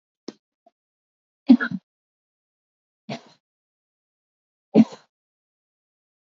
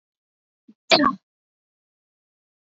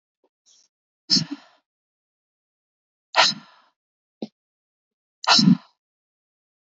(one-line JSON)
{"three_cough_length": "6.3 s", "three_cough_amplitude": 24773, "three_cough_signal_mean_std_ratio": 0.16, "cough_length": "2.7 s", "cough_amplitude": 28987, "cough_signal_mean_std_ratio": 0.21, "exhalation_length": "6.7 s", "exhalation_amplitude": 23300, "exhalation_signal_mean_std_ratio": 0.24, "survey_phase": "alpha (2021-03-01 to 2021-08-12)", "age": "45-64", "gender": "Female", "wearing_mask": "No", "symptom_fatigue": true, "smoker_status": "Current smoker (1 to 10 cigarettes per day)", "respiratory_condition_asthma": false, "respiratory_condition_other": false, "recruitment_source": "REACT", "submission_delay": "1 day", "covid_test_result": "Negative", "covid_test_method": "RT-qPCR"}